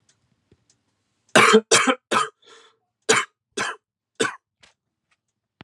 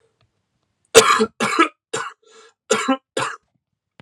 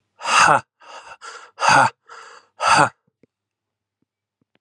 {"three_cough_length": "5.6 s", "three_cough_amplitude": 32497, "three_cough_signal_mean_std_ratio": 0.31, "cough_length": "4.0 s", "cough_amplitude": 32768, "cough_signal_mean_std_ratio": 0.36, "exhalation_length": "4.6 s", "exhalation_amplitude": 30327, "exhalation_signal_mean_std_ratio": 0.37, "survey_phase": "alpha (2021-03-01 to 2021-08-12)", "age": "18-44", "gender": "Male", "wearing_mask": "No", "symptom_none": true, "symptom_onset": "2 days", "smoker_status": "Never smoked", "respiratory_condition_asthma": false, "respiratory_condition_other": false, "recruitment_source": "Test and Trace", "submission_delay": "1 day", "covid_ct_value": 39.8, "covid_ct_gene": "N gene"}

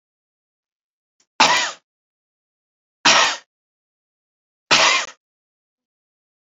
{"three_cough_length": "6.5 s", "three_cough_amplitude": 32218, "three_cough_signal_mean_std_ratio": 0.29, "survey_phase": "beta (2021-08-13 to 2022-03-07)", "age": "45-64", "gender": "Male", "wearing_mask": "No", "symptom_none": true, "smoker_status": "Never smoked", "respiratory_condition_asthma": false, "respiratory_condition_other": false, "recruitment_source": "Test and Trace", "submission_delay": "0 days", "covid_test_result": "Negative", "covid_test_method": "LFT"}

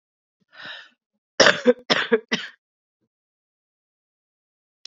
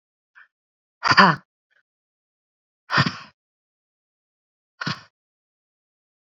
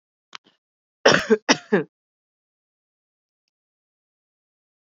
{"cough_length": "4.9 s", "cough_amplitude": 28057, "cough_signal_mean_std_ratio": 0.25, "exhalation_length": "6.3 s", "exhalation_amplitude": 31403, "exhalation_signal_mean_std_ratio": 0.21, "three_cough_length": "4.9 s", "three_cough_amplitude": 26953, "three_cough_signal_mean_std_ratio": 0.21, "survey_phase": "beta (2021-08-13 to 2022-03-07)", "age": "45-64", "gender": "Female", "wearing_mask": "No", "symptom_cough_any": true, "symptom_runny_or_blocked_nose": true, "symptom_sore_throat": true, "symptom_abdominal_pain": true, "symptom_fatigue": true, "symptom_headache": true, "symptom_change_to_sense_of_smell_or_taste": true, "symptom_loss_of_taste": true, "symptom_onset": "4 days", "smoker_status": "Ex-smoker", "respiratory_condition_asthma": false, "respiratory_condition_other": false, "recruitment_source": "Test and Trace", "submission_delay": "2 days", "covid_test_result": "Positive", "covid_test_method": "RT-qPCR", "covid_ct_value": 14.6, "covid_ct_gene": "ORF1ab gene", "covid_ct_mean": 15.0, "covid_viral_load": "12000000 copies/ml", "covid_viral_load_category": "High viral load (>1M copies/ml)"}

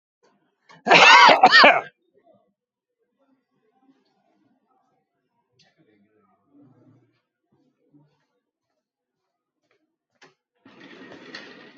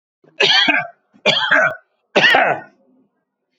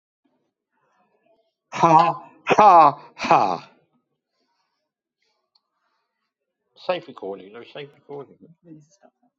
{"cough_length": "11.8 s", "cough_amplitude": 30458, "cough_signal_mean_std_ratio": 0.22, "three_cough_length": "3.6 s", "three_cough_amplitude": 29801, "three_cough_signal_mean_std_ratio": 0.52, "exhalation_length": "9.4 s", "exhalation_amplitude": 27878, "exhalation_signal_mean_std_ratio": 0.28, "survey_phase": "beta (2021-08-13 to 2022-03-07)", "age": "65+", "gender": "Male", "wearing_mask": "Yes", "symptom_none": true, "smoker_status": "Ex-smoker", "respiratory_condition_asthma": false, "respiratory_condition_other": false, "recruitment_source": "REACT", "submission_delay": "2 days", "covid_test_result": "Negative", "covid_test_method": "RT-qPCR", "influenza_a_test_result": "Negative", "influenza_b_test_result": "Negative"}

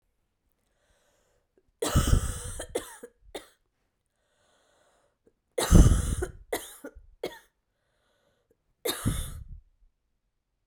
{"cough_length": "10.7 s", "cough_amplitude": 19889, "cough_signal_mean_std_ratio": 0.28, "survey_phase": "beta (2021-08-13 to 2022-03-07)", "age": "18-44", "gender": "Female", "wearing_mask": "No", "symptom_cough_any": true, "symptom_runny_or_blocked_nose": true, "symptom_fatigue": true, "symptom_change_to_sense_of_smell_or_taste": true, "smoker_status": "Never smoked", "respiratory_condition_asthma": false, "respiratory_condition_other": false, "recruitment_source": "Test and Trace", "submission_delay": "2 days", "covid_test_result": "Positive", "covid_test_method": "LFT"}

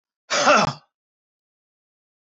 {"cough_length": "2.2 s", "cough_amplitude": 17852, "cough_signal_mean_std_ratio": 0.33, "survey_phase": "beta (2021-08-13 to 2022-03-07)", "age": "45-64", "gender": "Male", "wearing_mask": "No", "symptom_none": true, "smoker_status": "Current smoker (1 to 10 cigarettes per day)", "respiratory_condition_asthma": false, "respiratory_condition_other": false, "recruitment_source": "REACT", "submission_delay": "1 day", "covid_test_result": "Negative", "covid_test_method": "RT-qPCR", "influenza_a_test_result": "Negative", "influenza_b_test_result": "Negative"}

